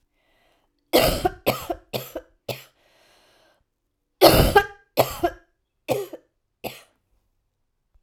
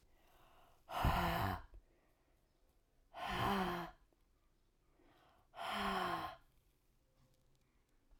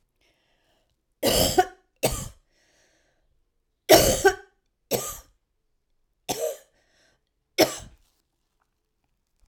{
  "cough_length": "8.0 s",
  "cough_amplitude": 32768,
  "cough_signal_mean_std_ratio": 0.31,
  "exhalation_length": "8.2 s",
  "exhalation_amplitude": 2671,
  "exhalation_signal_mean_std_ratio": 0.44,
  "three_cough_length": "9.5 s",
  "three_cough_amplitude": 32767,
  "three_cough_signal_mean_std_ratio": 0.28,
  "survey_phase": "alpha (2021-03-01 to 2021-08-12)",
  "age": "45-64",
  "gender": "Female",
  "wearing_mask": "No",
  "symptom_cough_any": true,
  "symptom_fatigue": true,
  "smoker_status": "Never smoked",
  "respiratory_condition_asthma": false,
  "respiratory_condition_other": false,
  "recruitment_source": "Test and Trace",
  "submission_delay": "1 day",
  "covid_test_result": "Positive",
  "covid_test_method": "RT-qPCR"
}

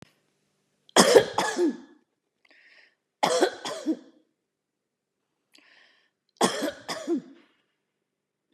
{
  "three_cough_length": "8.5 s",
  "three_cough_amplitude": 27924,
  "three_cough_signal_mean_std_ratio": 0.31,
  "survey_phase": "beta (2021-08-13 to 2022-03-07)",
  "age": "65+",
  "gender": "Female",
  "wearing_mask": "No",
  "symptom_none": true,
  "smoker_status": "Never smoked",
  "respiratory_condition_asthma": false,
  "respiratory_condition_other": true,
  "recruitment_source": "REACT",
  "submission_delay": "2 days",
  "covid_test_result": "Negative",
  "covid_test_method": "RT-qPCR",
  "influenza_a_test_result": "Unknown/Void",
  "influenza_b_test_result": "Unknown/Void"
}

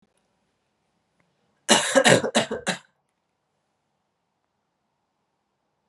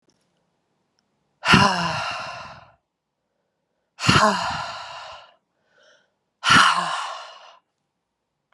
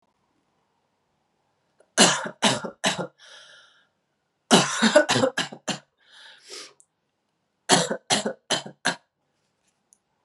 {
  "cough_length": "5.9 s",
  "cough_amplitude": 27010,
  "cough_signal_mean_std_ratio": 0.26,
  "exhalation_length": "8.5 s",
  "exhalation_amplitude": 31995,
  "exhalation_signal_mean_std_ratio": 0.37,
  "three_cough_length": "10.2 s",
  "three_cough_amplitude": 32085,
  "three_cough_signal_mean_std_ratio": 0.34,
  "survey_phase": "beta (2021-08-13 to 2022-03-07)",
  "age": "18-44",
  "gender": "Female",
  "wearing_mask": "No",
  "symptom_cough_any": true,
  "symptom_runny_or_blocked_nose": true,
  "symptom_sore_throat": true,
  "symptom_fatigue": true,
  "symptom_change_to_sense_of_smell_or_taste": true,
  "symptom_loss_of_taste": true,
  "symptom_onset": "4 days",
  "smoker_status": "Never smoked",
  "respiratory_condition_asthma": false,
  "respiratory_condition_other": false,
  "recruitment_source": "Test and Trace",
  "submission_delay": "2 days",
  "covid_test_result": "Negative",
  "covid_test_method": "RT-qPCR"
}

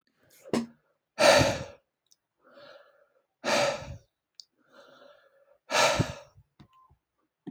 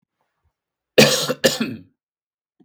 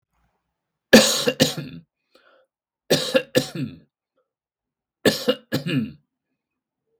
{
  "exhalation_length": "7.5 s",
  "exhalation_amplitude": 15391,
  "exhalation_signal_mean_std_ratio": 0.33,
  "cough_length": "2.6 s",
  "cough_amplitude": 32768,
  "cough_signal_mean_std_ratio": 0.32,
  "three_cough_length": "7.0 s",
  "three_cough_amplitude": 32768,
  "three_cough_signal_mean_std_ratio": 0.32,
  "survey_phase": "beta (2021-08-13 to 2022-03-07)",
  "age": "18-44",
  "gender": "Male",
  "wearing_mask": "No",
  "symptom_none": true,
  "smoker_status": "Never smoked",
  "respiratory_condition_asthma": false,
  "respiratory_condition_other": false,
  "recruitment_source": "Test and Trace",
  "submission_delay": "1 day",
  "covid_test_result": "Positive",
  "covid_test_method": "RT-qPCR",
  "covid_ct_value": 26.9,
  "covid_ct_gene": "ORF1ab gene",
  "covid_ct_mean": 27.6,
  "covid_viral_load": "870 copies/ml",
  "covid_viral_load_category": "Minimal viral load (< 10K copies/ml)"
}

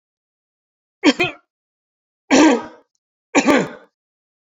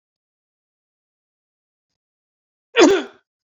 {
  "three_cough_length": "4.4 s",
  "three_cough_amplitude": 32767,
  "three_cough_signal_mean_std_ratio": 0.33,
  "cough_length": "3.6 s",
  "cough_amplitude": 32767,
  "cough_signal_mean_std_ratio": 0.21,
  "survey_phase": "beta (2021-08-13 to 2022-03-07)",
  "age": "45-64",
  "gender": "Male",
  "wearing_mask": "No",
  "symptom_none": true,
  "symptom_onset": "4 days",
  "smoker_status": "Ex-smoker",
  "respiratory_condition_asthma": false,
  "respiratory_condition_other": false,
  "recruitment_source": "REACT",
  "submission_delay": "0 days",
  "covid_test_result": "Negative",
  "covid_test_method": "RT-qPCR"
}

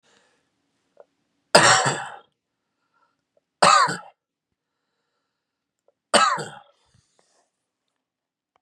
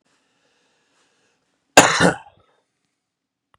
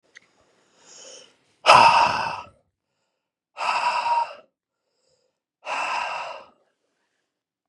{
  "three_cough_length": "8.6 s",
  "three_cough_amplitude": 32768,
  "three_cough_signal_mean_std_ratio": 0.26,
  "cough_length": "3.6 s",
  "cough_amplitude": 32768,
  "cough_signal_mean_std_ratio": 0.22,
  "exhalation_length": "7.7 s",
  "exhalation_amplitude": 32581,
  "exhalation_signal_mean_std_ratio": 0.35,
  "survey_phase": "beta (2021-08-13 to 2022-03-07)",
  "age": "45-64",
  "gender": "Male",
  "wearing_mask": "No",
  "symptom_none": true,
  "smoker_status": "Never smoked",
  "respiratory_condition_asthma": false,
  "respiratory_condition_other": false,
  "recruitment_source": "REACT",
  "submission_delay": "2 days",
  "covid_test_result": "Negative",
  "covid_test_method": "RT-qPCR",
  "influenza_a_test_result": "Negative",
  "influenza_b_test_result": "Negative"
}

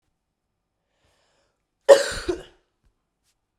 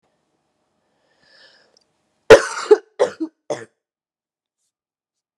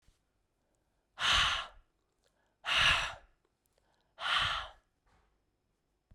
{
  "cough_length": "3.6 s",
  "cough_amplitude": 32767,
  "cough_signal_mean_std_ratio": 0.19,
  "three_cough_length": "5.4 s",
  "three_cough_amplitude": 32768,
  "three_cough_signal_mean_std_ratio": 0.19,
  "exhalation_length": "6.1 s",
  "exhalation_amplitude": 6304,
  "exhalation_signal_mean_std_ratio": 0.38,
  "survey_phase": "beta (2021-08-13 to 2022-03-07)",
  "age": "18-44",
  "gender": "Female",
  "wearing_mask": "No",
  "symptom_cough_any": true,
  "symptom_new_continuous_cough": true,
  "symptom_runny_or_blocked_nose": true,
  "symptom_shortness_of_breath": true,
  "symptom_sore_throat": true,
  "symptom_fatigue": true,
  "symptom_onset": "4 days",
  "smoker_status": "Never smoked",
  "respiratory_condition_asthma": false,
  "respiratory_condition_other": false,
  "recruitment_source": "Test and Trace",
  "submission_delay": "1 day",
  "covid_test_result": "Positive",
  "covid_test_method": "RT-qPCR",
  "covid_ct_value": 32.2,
  "covid_ct_gene": "N gene"
}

